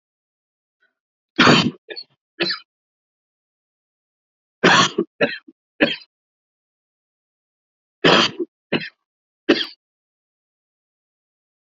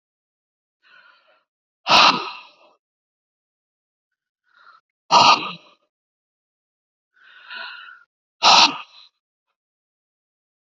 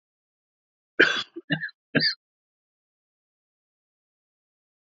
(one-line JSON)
{"three_cough_length": "11.8 s", "three_cough_amplitude": 29495, "three_cough_signal_mean_std_ratio": 0.28, "exhalation_length": "10.8 s", "exhalation_amplitude": 32767, "exhalation_signal_mean_std_ratio": 0.25, "cough_length": "4.9 s", "cough_amplitude": 27675, "cough_signal_mean_std_ratio": 0.23, "survey_phase": "beta (2021-08-13 to 2022-03-07)", "age": "65+", "gender": "Male", "wearing_mask": "No", "symptom_none": true, "smoker_status": "Ex-smoker", "respiratory_condition_asthma": true, "respiratory_condition_other": false, "recruitment_source": "REACT", "submission_delay": "1 day", "covid_test_result": "Negative", "covid_test_method": "RT-qPCR", "influenza_a_test_result": "Negative", "influenza_b_test_result": "Negative"}